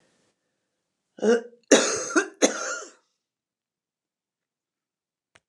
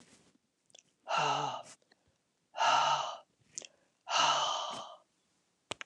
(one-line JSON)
{"cough_length": "5.5 s", "cough_amplitude": 26906, "cough_signal_mean_std_ratio": 0.29, "exhalation_length": "5.9 s", "exhalation_amplitude": 5626, "exhalation_signal_mean_std_ratio": 0.46, "survey_phase": "beta (2021-08-13 to 2022-03-07)", "age": "65+", "gender": "Female", "wearing_mask": "No", "symptom_cough_any": true, "symptom_runny_or_blocked_nose": true, "symptom_onset": "8 days", "smoker_status": "Never smoked", "respiratory_condition_asthma": false, "respiratory_condition_other": false, "recruitment_source": "REACT", "submission_delay": "2 days", "covid_test_result": "Negative", "covid_test_method": "RT-qPCR", "influenza_a_test_result": "Negative", "influenza_b_test_result": "Negative"}